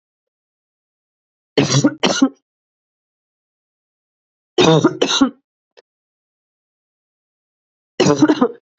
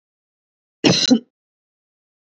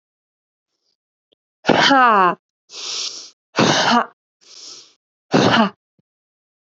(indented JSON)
{
  "three_cough_length": "8.8 s",
  "three_cough_amplitude": 32767,
  "three_cough_signal_mean_std_ratio": 0.33,
  "cough_length": "2.2 s",
  "cough_amplitude": 27890,
  "cough_signal_mean_std_ratio": 0.29,
  "exhalation_length": "6.7 s",
  "exhalation_amplitude": 27529,
  "exhalation_signal_mean_std_ratio": 0.41,
  "survey_phase": "beta (2021-08-13 to 2022-03-07)",
  "age": "18-44",
  "gender": "Female",
  "wearing_mask": "Yes",
  "symptom_cough_any": true,
  "symptom_runny_or_blocked_nose": true,
  "symptom_headache": true,
  "symptom_other": true,
  "symptom_onset": "4 days",
  "smoker_status": "Never smoked",
  "respiratory_condition_asthma": false,
  "respiratory_condition_other": false,
  "recruitment_source": "Test and Trace",
  "submission_delay": "2 days",
  "covid_test_result": "Positive",
  "covid_test_method": "RT-qPCR",
  "covid_ct_value": 16.1,
  "covid_ct_gene": "ORF1ab gene",
  "covid_ct_mean": 16.3,
  "covid_viral_load": "4400000 copies/ml",
  "covid_viral_load_category": "High viral load (>1M copies/ml)"
}